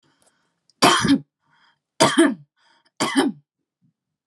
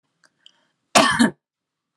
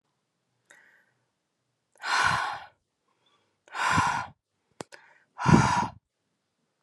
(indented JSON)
{
  "three_cough_length": "4.3 s",
  "three_cough_amplitude": 32153,
  "three_cough_signal_mean_std_ratio": 0.38,
  "cough_length": "2.0 s",
  "cough_amplitude": 32767,
  "cough_signal_mean_std_ratio": 0.32,
  "exhalation_length": "6.8 s",
  "exhalation_amplitude": 21188,
  "exhalation_signal_mean_std_ratio": 0.35,
  "survey_phase": "alpha (2021-03-01 to 2021-08-12)",
  "age": "18-44",
  "gender": "Female",
  "wearing_mask": "No",
  "symptom_headache": true,
  "smoker_status": "Ex-smoker",
  "respiratory_condition_asthma": false,
  "respiratory_condition_other": false,
  "recruitment_source": "REACT",
  "submission_delay": "2 days",
  "covid_test_result": "Negative",
  "covid_test_method": "RT-qPCR"
}